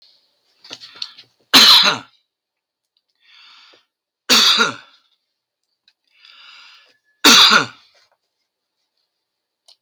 {"three_cough_length": "9.8 s", "three_cough_amplitude": 32768, "three_cough_signal_mean_std_ratio": 0.29, "survey_phase": "beta (2021-08-13 to 2022-03-07)", "age": "65+", "gender": "Male", "wearing_mask": "No", "symptom_none": true, "smoker_status": "Ex-smoker", "respiratory_condition_asthma": false, "respiratory_condition_other": false, "recruitment_source": "REACT", "submission_delay": "3 days", "covid_test_result": "Negative", "covid_test_method": "RT-qPCR", "influenza_a_test_result": "Unknown/Void", "influenza_b_test_result": "Unknown/Void"}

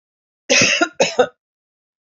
{"cough_length": "2.1 s", "cough_amplitude": 27886, "cough_signal_mean_std_ratio": 0.41, "survey_phase": "alpha (2021-03-01 to 2021-08-12)", "age": "45-64", "gender": "Female", "wearing_mask": "No", "symptom_none": true, "symptom_onset": "8 days", "smoker_status": "Never smoked", "respiratory_condition_asthma": false, "respiratory_condition_other": false, "recruitment_source": "REACT", "submission_delay": "4 days", "covid_test_result": "Negative", "covid_test_method": "RT-qPCR"}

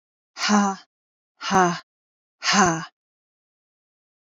{"exhalation_length": "4.3 s", "exhalation_amplitude": 25380, "exhalation_signal_mean_std_ratio": 0.38, "survey_phase": "beta (2021-08-13 to 2022-03-07)", "age": "45-64", "gender": "Female", "wearing_mask": "No", "symptom_none": true, "smoker_status": "Never smoked", "respiratory_condition_asthma": false, "respiratory_condition_other": false, "recruitment_source": "REACT", "submission_delay": "15 days", "covid_test_result": "Negative", "covid_test_method": "RT-qPCR", "influenza_a_test_result": "Negative", "influenza_b_test_result": "Negative"}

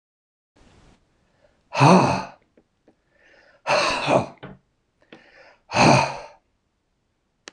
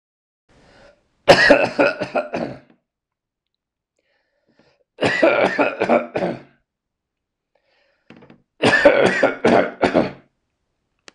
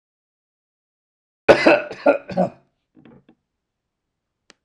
{"exhalation_length": "7.5 s", "exhalation_amplitude": 24842, "exhalation_signal_mean_std_ratio": 0.34, "three_cough_length": "11.1 s", "three_cough_amplitude": 26028, "three_cough_signal_mean_std_ratio": 0.41, "cough_length": "4.6 s", "cough_amplitude": 26028, "cough_signal_mean_std_ratio": 0.26, "survey_phase": "alpha (2021-03-01 to 2021-08-12)", "age": "65+", "gender": "Male", "wearing_mask": "No", "symptom_none": true, "smoker_status": "Ex-smoker", "respiratory_condition_asthma": false, "respiratory_condition_other": false, "recruitment_source": "REACT", "submission_delay": "2 days", "covid_test_result": "Negative", "covid_test_method": "RT-qPCR"}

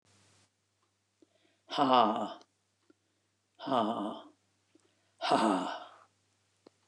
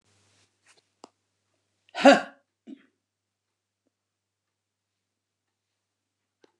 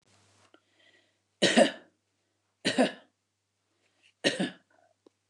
{"exhalation_length": "6.9 s", "exhalation_amplitude": 9906, "exhalation_signal_mean_std_ratio": 0.36, "cough_length": "6.6 s", "cough_amplitude": 28284, "cough_signal_mean_std_ratio": 0.13, "three_cough_length": "5.3 s", "three_cough_amplitude": 12535, "three_cough_signal_mean_std_ratio": 0.27, "survey_phase": "beta (2021-08-13 to 2022-03-07)", "age": "65+", "gender": "Female", "wearing_mask": "No", "symptom_cough_any": true, "symptom_fatigue": true, "symptom_headache": true, "smoker_status": "Never smoked", "respiratory_condition_asthma": false, "respiratory_condition_other": false, "recruitment_source": "REACT", "submission_delay": "2 days", "covid_test_result": "Negative", "covid_test_method": "RT-qPCR", "influenza_a_test_result": "Negative", "influenza_b_test_result": "Negative"}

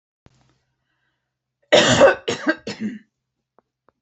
{"cough_length": "4.0 s", "cough_amplitude": 28646, "cough_signal_mean_std_ratio": 0.32, "survey_phase": "alpha (2021-03-01 to 2021-08-12)", "age": "65+", "gender": "Female", "wearing_mask": "No", "symptom_none": true, "smoker_status": "Ex-smoker", "respiratory_condition_asthma": false, "respiratory_condition_other": false, "recruitment_source": "REACT", "submission_delay": "2 days", "covid_test_result": "Negative", "covid_test_method": "RT-qPCR"}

